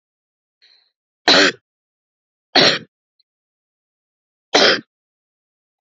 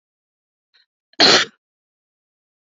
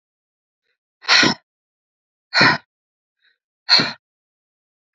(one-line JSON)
{"three_cough_length": "5.8 s", "three_cough_amplitude": 32767, "three_cough_signal_mean_std_ratio": 0.28, "cough_length": "2.6 s", "cough_amplitude": 30244, "cough_signal_mean_std_ratio": 0.24, "exhalation_length": "4.9 s", "exhalation_amplitude": 30235, "exhalation_signal_mean_std_ratio": 0.29, "survey_phase": "beta (2021-08-13 to 2022-03-07)", "age": "18-44", "gender": "Female", "wearing_mask": "No", "symptom_none": true, "smoker_status": "Never smoked", "respiratory_condition_asthma": false, "respiratory_condition_other": false, "recruitment_source": "REACT", "submission_delay": "12 days", "covid_test_result": "Negative", "covid_test_method": "RT-qPCR", "influenza_a_test_result": "Unknown/Void", "influenza_b_test_result": "Unknown/Void"}